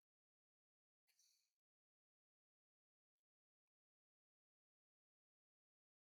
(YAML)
cough_length: 6.1 s
cough_amplitude: 17
cough_signal_mean_std_ratio: 0.17
survey_phase: beta (2021-08-13 to 2022-03-07)
age: 65+
gender: Female
wearing_mask: 'No'
symptom_cough_any: true
symptom_shortness_of_breath: true
symptom_fatigue: true
symptom_headache: true
symptom_onset: 12 days
smoker_status: Never smoked
respiratory_condition_asthma: false
respiratory_condition_other: true
recruitment_source: REACT
submission_delay: 1 day
covid_test_result: Negative
covid_test_method: RT-qPCR